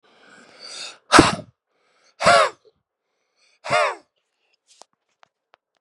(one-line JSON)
{"exhalation_length": "5.8 s", "exhalation_amplitude": 32768, "exhalation_signal_mean_std_ratio": 0.28, "survey_phase": "beta (2021-08-13 to 2022-03-07)", "age": "18-44", "gender": "Male", "wearing_mask": "No", "symptom_cough_any": true, "symptom_runny_or_blocked_nose": true, "symptom_diarrhoea": true, "symptom_fatigue": true, "symptom_onset": "3 days", "smoker_status": "Current smoker (e-cigarettes or vapes only)", "respiratory_condition_asthma": false, "respiratory_condition_other": false, "recruitment_source": "Test and Trace", "submission_delay": "1 day", "covid_test_result": "Positive", "covid_test_method": "RT-qPCR", "covid_ct_value": 15.1, "covid_ct_gene": "ORF1ab gene", "covid_ct_mean": 15.4, "covid_viral_load": "8900000 copies/ml", "covid_viral_load_category": "High viral load (>1M copies/ml)"}